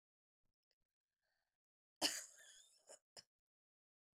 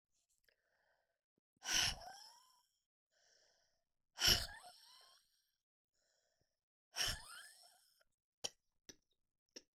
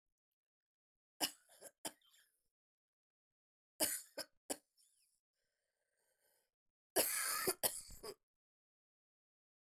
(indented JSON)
{
  "cough_length": "4.2 s",
  "cough_amplitude": 2337,
  "cough_signal_mean_std_ratio": 0.18,
  "exhalation_length": "9.8 s",
  "exhalation_amplitude": 3630,
  "exhalation_signal_mean_std_ratio": 0.24,
  "three_cough_length": "9.8 s",
  "three_cough_amplitude": 3422,
  "three_cough_signal_mean_std_ratio": 0.26,
  "survey_phase": "beta (2021-08-13 to 2022-03-07)",
  "age": "45-64",
  "gender": "Female",
  "wearing_mask": "No",
  "symptom_cough_any": true,
  "symptom_runny_or_blocked_nose": true,
  "symptom_shortness_of_breath": true,
  "symptom_fatigue": true,
  "symptom_fever_high_temperature": true,
  "symptom_headache": true,
  "smoker_status": "Never smoked",
  "respiratory_condition_asthma": true,
  "respiratory_condition_other": false,
  "recruitment_source": "Test and Trace",
  "submission_delay": "1 day",
  "covid_test_result": "Positive",
  "covid_test_method": "LFT"
}